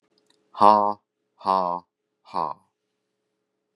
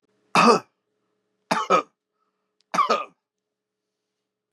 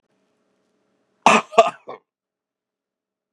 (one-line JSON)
{"exhalation_length": "3.8 s", "exhalation_amplitude": 29412, "exhalation_signal_mean_std_ratio": 0.28, "three_cough_length": "4.5 s", "three_cough_amplitude": 28723, "three_cough_signal_mean_std_ratio": 0.31, "cough_length": "3.3 s", "cough_amplitude": 32768, "cough_signal_mean_std_ratio": 0.21, "survey_phase": "beta (2021-08-13 to 2022-03-07)", "age": "65+", "gender": "Male", "wearing_mask": "No", "symptom_sore_throat": true, "smoker_status": "Never smoked", "respiratory_condition_asthma": false, "respiratory_condition_other": false, "recruitment_source": "REACT", "submission_delay": "2 days", "covid_test_result": "Negative", "covid_test_method": "RT-qPCR", "influenza_a_test_result": "Unknown/Void", "influenza_b_test_result": "Unknown/Void"}